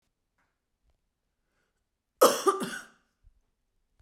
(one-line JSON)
{"cough_length": "4.0 s", "cough_amplitude": 17201, "cough_signal_mean_std_ratio": 0.22, "survey_phase": "beta (2021-08-13 to 2022-03-07)", "age": "18-44", "gender": "Female", "wearing_mask": "No", "symptom_cough_any": true, "symptom_new_continuous_cough": true, "symptom_sore_throat": true, "symptom_change_to_sense_of_smell_or_taste": true, "smoker_status": "Never smoked", "respiratory_condition_asthma": false, "respiratory_condition_other": false, "recruitment_source": "Test and Trace", "submission_delay": "1 day", "covid_test_result": "Negative", "covid_test_method": "RT-qPCR"}